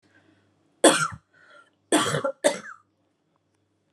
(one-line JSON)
{"cough_length": "3.9 s", "cough_amplitude": 26311, "cough_signal_mean_std_ratio": 0.32, "survey_phase": "alpha (2021-03-01 to 2021-08-12)", "age": "18-44", "gender": "Female", "wearing_mask": "No", "symptom_none": true, "smoker_status": "Ex-smoker", "respiratory_condition_asthma": false, "respiratory_condition_other": false, "recruitment_source": "REACT", "submission_delay": "3 days", "covid_test_result": "Negative", "covid_test_method": "RT-qPCR"}